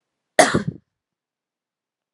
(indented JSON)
{
  "cough_length": "2.1 s",
  "cough_amplitude": 32767,
  "cough_signal_mean_std_ratio": 0.23,
  "survey_phase": "alpha (2021-03-01 to 2021-08-12)",
  "age": "18-44",
  "gender": "Female",
  "wearing_mask": "No",
  "symptom_none": true,
  "smoker_status": "Ex-smoker",
  "respiratory_condition_asthma": false,
  "respiratory_condition_other": false,
  "recruitment_source": "REACT",
  "submission_delay": "1 day",
  "covid_test_result": "Negative",
  "covid_test_method": "RT-qPCR"
}